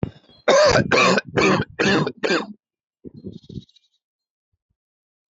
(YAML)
cough_length: 5.3 s
cough_amplitude: 25544
cough_signal_mean_std_ratio: 0.46
survey_phase: alpha (2021-03-01 to 2021-08-12)
age: 18-44
gender: Male
wearing_mask: 'No'
symptom_none: true
symptom_onset: 5 days
smoker_status: Ex-smoker
respiratory_condition_asthma: false
respiratory_condition_other: false
recruitment_source: REACT
submission_delay: 4 days
covid_test_result: Negative
covid_test_method: RT-qPCR